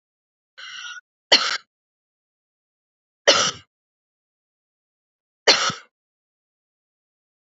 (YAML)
three_cough_length: 7.5 s
three_cough_amplitude: 31838
three_cough_signal_mean_std_ratio: 0.23
survey_phase: beta (2021-08-13 to 2022-03-07)
age: 45-64
gender: Female
wearing_mask: 'No'
symptom_none: true
symptom_onset: 12 days
smoker_status: Never smoked
respiratory_condition_asthma: true
respiratory_condition_other: false
recruitment_source: REACT
submission_delay: 1 day
covid_test_result: Negative
covid_test_method: RT-qPCR